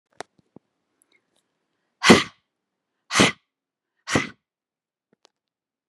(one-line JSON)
{"exhalation_length": "5.9 s", "exhalation_amplitude": 32768, "exhalation_signal_mean_std_ratio": 0.21, "survey_phase": "beta (2021-08-13 to 2022-03-07)", "age": "45-64", "gender": "Female", "wearing_mask": "No", "symptom_none": true, "smoker_status": "Never smoked", "respiratory_condition_asthma": false, "respiratory_condition_other": false, "recruitment_source": "REACT", "submission_delay": "1 day", "covid_test_result": "Negative", "covid_test_method": "RT-qPCR"}